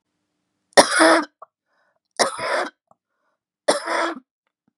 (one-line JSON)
{"three_cough_length": "4.8 s", "three_cough_amplitude": 32768, "three_cough_signal_mean_std_ratio": 0.34, "survey_phase": "beta (2021-08-13 to 2022-03-07)", "age": "45-64", "gender": "Female", "wearing_mask": "No", "symptom_cough_any": true, "symptom_fatigue": true, "symptom_change_to_sense_of_smell_or_taste": true, "symptom_loss_of_taste": true, "symptom_onset": "10 days", "smoker_status": "Never smoked", "respiratory_condition_asthma": false, "respiratory_condition_other": false, "recruitment_source": "REACT", "submission_delay": "3 days", "covid_test_result": "Positive", "covid_test_method": "RT-qPCR", "covid_ct_value": 28.0, "covid_ct_gene": "E gene", "influenza_a_test_result": "Negative", "influenza_b_test_result": "Negative"}